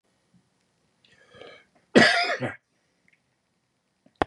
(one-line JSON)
{"cough_length": "4.3 s", "cough_amplitude": 27216, "cough_signal_mean_std_ratio": 0.25, "survey_phase": "beta (2021-08-13 to 2022-03-07)", "age": "65+", "gender": "Male", "wearing_mask": "No", "symptom_none": true, "smoker_status": "Never smoked", "respiratory_condition_asthma": false, "respiratory_condition_other": false, "recruitment_source": "REACT", "submission_delay": "2 days", "covid_test_result": "Negative", "covid_test_method": "RT-qPCR", "influenza_a_test_result": "Negative", "influenza_b_test_result": "Negative"}